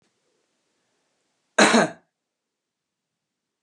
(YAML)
cough_length: 3.6 s
cough_amplitude: 26988
cough_signal_mean_std_ratio: 0.22
survey_phase: beta (2021-08-13 to 2022-03-07)
age: 65+
gender: Male
wearing_mask: 'No'
symptom_cough_any: true
smoker_status: Never smoked
respiratory_condition_asthma: false
respiratory_condition_other: false
recruitment_source: REACT
submission_delay: 6 days
covid_test_result: Negative
covid_test_method: RT-qPCR